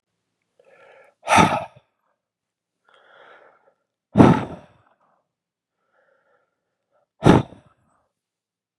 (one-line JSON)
{"exhalation_length": "8.8 s", "exhalation_amplitude": 32768, "exhalation_signal_mean_std_ratio": 0.22, "survey_phase": "beta (2021-08-13 to 2022-03-07)", "age": "45-64", "gender": "Male", "wearing_mask": "No", "symptom_cough_any": true, "symptom_runny_or_blocked_nose": true, "symptom_sore_throat": true, "symptom_headache": true, "symptom_onset": "3 days", "smoker_status": "Never smoked", "respiratory_condition_asthma": false, "respiratory_condition_other": false, "recruitment_source": "Test and Trace", "submission_delay": "1 day", "covid_test_result": "Positive", "covid_test_method": "ePCR"}